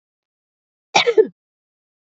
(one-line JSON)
{"cough_length": "2.0 s", "cough_amplitude": 27660, "cough_signal_mean_std_ratio": 0.26, "survey_phase": "beta (2021-08-13 to 2022-03-07)", "age": "18-44", "gender": "Female", "wearing_mask": "No", "symptom_none": true, "smoker_status": "Never smoked", "respiratory_condition_asthma": false, "respiratory_condition_other": false, "recruitment_source": "REACT", "submission_delay": "9 days", "covid_test_result": "Negative", "covid_test_method": "RT-qPCR"}